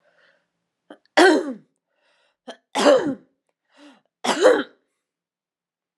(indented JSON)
{
  "three_cough_length": "6.0 s",
  "three_cough_amplitude": 29966,
  "three_cough_signal_mean_std_ratio": 0.32,
  "survey_phase": "alpha (2021-03-01 to 2021-08-12)",
  "age": "18-44",
  "gender": "Female",
  "wearing_mask": "No",
  "symptom_none": true,
  "smoker_status": "Never smoked",
  "respiratory_condition_asthma": false,
  "respiratory_condition_other": false,
  "recruitment_source": "REACT",
  "submission_delay": "2 days",
  "covid_test_result": "Negative",
  "covid_test_method": "RT-qPCR",
  "covid_ct_value": 39.0,
  "covid_ct_gene": "N gene"
}